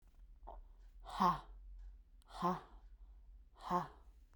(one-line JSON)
{"exhalation_length": "4.4 s", "exhalation_amplitude": 3176, "exhalation_signal_mean_std_ratio": 0.43, "survey_phase": "beta (2021-08-13 to 2022-03-07)", "age": "18-44", "gender": "Female", "wearing_mask": "No", "symptom_cough_any": true, "symptom_runny_or_blocked_nose": true, "symptom_sore_throat": true, "symptom_fatigue": true, "symptom_change_to_sense_of_smell_or_taste": true, "symptom_loss_of_taste": true, "symptom_onset": "4 days", "smoker_status": "Never smoked", "respiratory_condition_asthma": false, "respiratory_condition_other": false, "recruitment_source": "Test and Trace", "submission_delay": "2 days", "covid_test_result": "Positive", "covid_test_method": "RT-qPCR", "covid_ct_value": 23.6, "covid_ct_gene": "ORF1ab gene"}